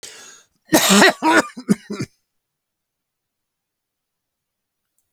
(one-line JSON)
{"cough_length": "5.1 s", "cough_amplitude": 31251, "cough_signal_mean_std_ratio": 0.31, "survey_phase": "alpha (2021-03-01 to 2021-08-12)", "age": "65+", "gender": "Male", "wearing_mask": "No", "symptom_none": true, "smoker_status": "Never smoked", "respiratory_condition_asthma": false, "respiratory_condition_other": false, "recruitment_source": "REACT", "submission_delay": "1 day", "covid_test_result": "Negative", "covid_test_method": "RT-qPCR"}